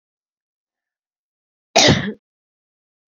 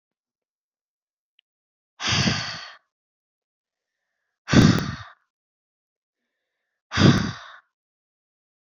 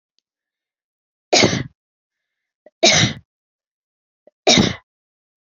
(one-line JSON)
{"cough_length": "3.1 s", "cough_amplitude": 32768, "cough_signal_mean_std_ratio": 0.25, "exhalation_length": "8.6 s", "exhalation_amplitude": 26416, "exhalation_signal_mean_std_ratio": 0.27, "three_cough_length": "5.5 s", "three_cough_amplitude": 32768, "three_cough_signal_mean_std_ratio": 0.3, "survey_phase": "beta (2021-08-13 to 2022-03-07)", "age": "45-64", "gender": "Female", "wearing_mask": "No", "symptom_none": true, "smoker_status": "Ex-smoker", "respiratory_condition_asthma": false, "respiratory_condition_other": false, "recruitment_source": "REACT", "submission_delay": "1 day", "covid_test_result": "Negative", "covid_test_method": "RT-qPCR", "influenza_a_test_result": "Negative", "influenza_b_test_result": "Negative"}